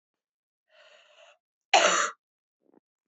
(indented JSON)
{
  "cough_length": "3.1 s",
  "cough_amplitude": 15945,
  "cough_signal_mean_std_ratio": 0.27,
  "survey_phase": "beta (2021-08-13 to 2022-03-07)",
  "age": "18-44",
  "gender": "Female",
  "wearing_mask": "No",
  "symptom_cough_any": true,
  "symptom_new_continuous_cough": true,
  "symptom_runny_or_blocked_nose": true,
  "symptom_sore_throat": true,
  "symptom_headache": true,
  "symptom_onset": "4 days",
  "smoker_status": "Never smoked",
  "respiratory_condition_asthma": false,
  "respiratory_condition_other": false,
  "recruitment_source": "Test and Trace",
  "submission_delay": "1 day",
  "covid_test_result": "Negative",
  "covid_test_method": "RT-qPCR"
}